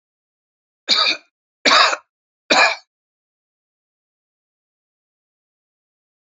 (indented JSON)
{
  "three_cough_length": "6.3 s",
  "three_cough_amplitude": 32768,
  "three_cough_signal_mean_std_ratio": 0.28,
  "survey_phase": "beta (2021-08-13 to 2022-03-07)",
  "age": "45-64",
  "gender": "Male",
  "wearing_mask": "No",
  "symptom_none": true,
  "smoker_status": "Never smoked",
  "respiratory_condition_asthma": false,
  "respiratory_condition_other": false,
  "recruitment_source": "REACT",
  "submission_delay": "2 days",
  "covid_test_result": "Negative",
  "covid_test_method": "RT-qPCR",
  "influenza_a_test_result": "Unknown/Void",
  "influenza_b_test_result": "Unknown/Void"
}